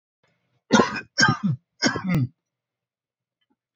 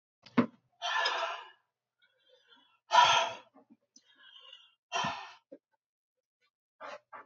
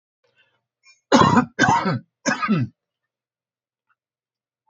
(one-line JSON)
{"cough_length": "3.8 s", "cough_amplitude": 25077, "cough_signal_mean_std_ratio": 0.39, "exhalation_length": "7.3 s", "exhalation_amplitude": 10195, "exhalation_signal_mean_std_ratio": 0.32, "three_cough_length": "4.7 s", "three_cough_amplitude": 27595, "three_cough_signal_mean_std_ratio": 0.37, "survey_phase": "beta (2021-08-13 to 2022-03-07)", "age": "45-64", "gender": "Male", "wearing_mask": "No", "symptom_cough_any": true, "smoker_status": "Never smoked", "respiratory_condition_asthma": false, "respiratory_condition_other": false, "recruitment_source": "REACT", "submission_delay": "10 days", "covid_test_result": "Negative", "covid_test_method": "RT-qPCR", "influenza_a_test_result": "Negative", "influenza_b_test_result": "Negative"}